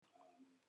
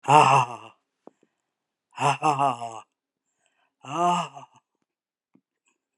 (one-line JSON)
{"cough_length": "0.7 s", "cough_amplitude": 59, "cough_signal_mean_std_ratio": 0.94, "exhalation_length": "6.0 s", "exhalation_amplitude": 24510, "exhalation_signal_mean_std_ratio": 0.35, "survey_phase": "alpha (2021-03-01 to 2021-08-12)", "age": "65+", "gender": "Female", "wearing_mask": "No", "symptom_none": true, "smoker_status": "Never smoked", "respiratory_condition_asthma": false, "respiratory_condition_other": false, "recruitment_source": "REACT", "submission_delay": "2 days", "covid_test_result": "Negative", "covid_test_method": "RT-qPCR"}